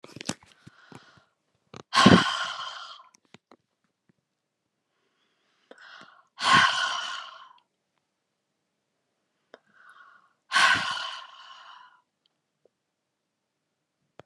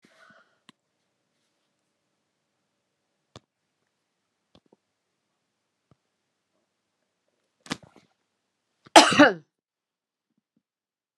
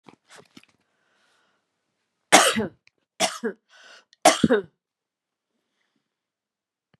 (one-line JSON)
{"exhalation_length": "14.3 s", "exhalation_amplitude": 26318, "exhalation_signal_mean_std_ratio": 0.27, "cough_length": "11.2 s", "cough_amplitude": 32767, "cough_signal_mean_std_ratio": 0.13, "three_cough_length": "7.0 s", "three_cough_amplitude": 32767, "three_cough_signal_mean_std_ratio": 0.24, "survey_phase": "beta (2021-08-13 to 2022-03-07)", "age": "65+", "gender": "Female", "wearing_mask": "No", "symptom_none": true, "smoker_status": "Ex-smoker", "respiratory_condition_asthma": false, "respiratory_condition_other": false, "recruitment_source": "REACT", "submission_delay": "2 days", "covid_test_result": "Negative", "covid_test_method": "RT-qPCR", "influenza_a_test_result": "Unknown/Void", "influenza_b_test_result": "Unknown/Void"}